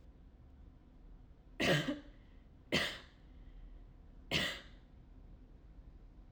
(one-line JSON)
{"three_cough_length": "6.3 s", "three_cough_amplitude": 3788, "three_cough_signal_mean_std_ratio": 0.44, "survey_phase": "alpha (2021-03-01 to 2021-08-12)", "age": "18-44", "gender": "Female", "wearing_mask": "Yes", "symptom_none": true, "smoker_status": "Never smoked", "respiratory_condition_asthma": false, "respiratory_condition_other": false, "recruitment_source": "REACT", "submission_delay": "1 day", "covid_test_result": "Negative", "covid_test_method": "RT-qPCR"}